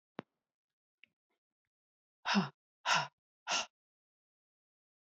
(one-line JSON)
{"exhalation_length": "5.0 s", "exhalation_amplitude": 3897, "exhalation_signal_mean_std_ratio": 0.26, "survey_phase": "beta (2021-08-13 to 2022-03-07)", "age": "45-64", "gender": "Female", "wearing_mask": "No", "symptom_cough_any": true, "symptom_runny_or_blocked_nose": true, "symptom_sore_throat": true, "symptom_fever_high_temperature": true, "symptom_headache": true, "symptom_change_to_sense_of_smell_or_taste": true, "symptom_onset": "2 days", "smoker_status": "Never smoked", "respiratory_condition_asthma": false, "respiratory_condition_other": false, "recruitment_source": "Test and Trace", "submission_delay": "0 days", "covid_test_result": "Positive", "covid_test_method": "RT-qPCR", "covid_ct_value": 21.5, "covid_ct_gene": "ORF1ab gene", "covid_ct_mean": 21.6, "covid_viral_load": "83000 copies/ml", "covid_viral_load_category": "Low viral load (10K-1M copies/ml)"}